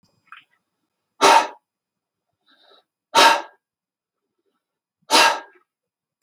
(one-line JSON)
{"exhalation_length": "6.2 s", "exhalation_amplitude": 32768, "exhalation_signal_mean_std_ratio": 0.27, "survey_phase": "beta (2021-08-13 to 2022-03-07)", "age": "45-64", "gender": "Male", "wearing_mask": "No", "symptom_runny_or_blocked_nose": true, "smoker_status": "Never smoked", "respiratory_condition_asthma": true, "respiratory_condition_other": false, "recruitment_source": "REACT", "submission_delay": "0 days", "covid_test_result": "Negative", "covid_test_method": "RT-qPCR", "influenza_a_test_result": "Negative", "influenza_b_test_result": "Negative"}